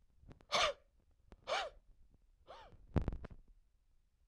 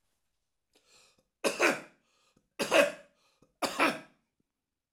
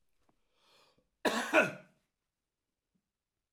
{
  "exhalation_length": "4.3 s",
  "exhalation_amplitude": 3954,
  "exhalation_signal_mean_std_ratio": 0.35,
  "three_cough_length": "4.9 s",
  "three_cough_amplitude": 12804,
  "three_cough_signal_mean_std_ratio": 0.32,
  "cough_length": "3.5 s",
  "cough_amplitude": 7579,
  "cough_signal_mean_std_ratio": 0.25,
  "survey_phase": "alpha (2021-03-01 to 2021-08-12)",
  "age": "65+",
  "gender": "Male",
  "wearing_mask": "No",
  "symptom_none": true,
  "symptom_cough_any": true,
  "smoker_status": "Never smoked",
  "respiratory_condition_asthma": false,
  "respiratory_condition_other": false,
  "recruitment_source": "REACT",
  "submission_delay": "1 day",
  "covid_test_result": "Negative",
  "covid_test_method": "RT-qPCR"
}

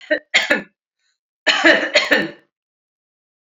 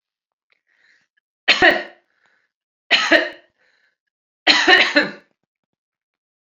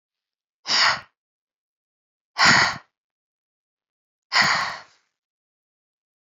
{
  "cough_length": "3.4 s",
  "cough_amplitude": 31376,
  "cough_signal_mean_std_ratio": 0.42,
  "three_cough_length": "6.5 s",
  "three_cough_amplitude": 30548,
  "three_cough_signal_mean_std_ratio": 0.33,
  "exhalation_length": "6.2 s",
  "exhalation_amplitude": 26031,
  "exhalation_signal_mean_std_ratio": 0.32,
  "survey_phase": "beta (2021-08-13 to 2022-03-07)",
  "age": "45-64",
  "gender": "Female",
  "wearing_mask": "No",
  "symptom_none": true,
  "smoker_status": "Never smoked",
  "respiratory_condition_asthma": false,
  "respiratory_condition_other": false,
  "recruitment_source": "REACT",
  "submission_delay": "2 days",
  "covid_test_result": "Negative",
  "covid_test_method": "RT-qPCR"
}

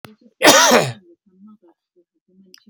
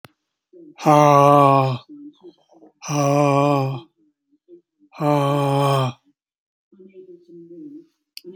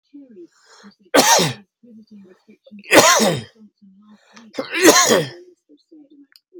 {
  "cough_length": "2.7 s",
  "cough_amplitude": 32767,
  "cough_signal_mean_std_ratio": 0.35,
  "exhalation_length": "8.4 s",
  "exhalation_amplitude": 27748,
  "exhalation_signal_mean_std_ratio": 0.46,
  "three_cough_length": "6.6 s",
  "three_cough_amplitude": 32768,
  "three_cough_signal_mean_std_ratio": 0.39,
  "survey_phase": "beta (2021-08-13 to 2022-03-07)",
  "age": "65+",
  "gender": "Male",
  "wearing_mask": "No",
  "symptom_none": true,
  "smoker_status": "Ex-smoker",
  "respiratory_condition_asthma": false,
  "respiratory_condition_other": true,
  "recruitment_source": "REACT",
  "submission_delay": "1 day",
  "covid_test_result": "Negative",
  "covid_test_method": "RT-qPCR",
  "influenza_a_test_result": "Negative",
  "influenza_b_test_result": "Negative"
}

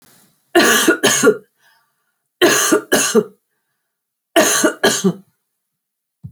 {
  "cough_length": "6.3 s",
  "cough_amplitude": 32073,
  "cough_signal_mean_std_ratio": 0.48,
  "survey_phase": "alpha (2021-03-01 to 2021-08-12)",
  "age": "45-64",
  "gender": "Female",
  "wearing_mask": "No",
  "symptom_none": true,
  "smoker_status": "Never smoked",
  "respiratory_condition_asthma": false,
  "respiratory_condition_other": false,
  "recruitment_source": "REACT",
  "submission_delay": "5 days",
  "covid_test_result": "Negative",
  "covid_test_method": "RT-qPCR"
}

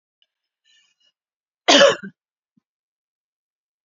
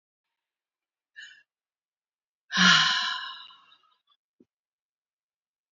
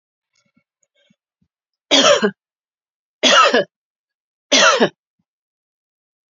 {
  "cough_length": "3.8 s",
  "cough_amplitude": 32767,
  "cough_signal_mean_std_ratio": 0.21,
  "exhalation_length": "5.7 s",
  "exhalation_amplitude": 15852,
  "exhalation_signal_mean_std_ratio": 0.27,
  "three_cough_length": "6.3 s",
  "three_cough_amplitude": 31741,
  "three_cough_signal_mean_std_ratio": 0.34,
  "survey_phase": "beta (2021-08-13 to 2022-03-07)",
  "age": "65+",
  "gender": "Female",
  "wearing_mask": "No",
  "symptom_sore_throat": true,
  "smoker_status": "Never smoked",
  "respiratory_condition_asthma": false,
  "respiratory_condition_other": false,
  "recruitment_source": "Test and Trace",
  "submission_delay": "3 days",
  "covid_test_result": "Positive",
  "covid_test_method": "RT-qPCR",
  "covid_ct_value": 24.9,
  "covid_ct_gene": "ORF1ab gene",
  "covid_ct_mean": 25.3,
  "covid_viral_load": "5000 copies/ml",
  "covid_viral_load_category": "Minimal viral load (< 10K copies/ml)"
}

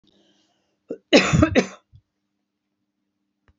{
  "cough_length": "3.6 s",
  "cough_amplitude": 28993,
  "cough_signal_mean_std_ratio": 0.27,
  "survey_phase": "beta (2021-08-13 to 2022-03-07)",
  "age": "65+",
  "gender": "Female",
  "wearing_mask": "No",
  "symptom_none": true,
  "smoker_status": "Never smoked",
  "respiratory_condition_asthma": false,
  "respiratory_condition_other": false,
  "recruitment_source": "Test and Trace",
  "submission_delay": "1 day",
  "covid_test_result": "Negative",
  "covid_test_method": "LFT"
}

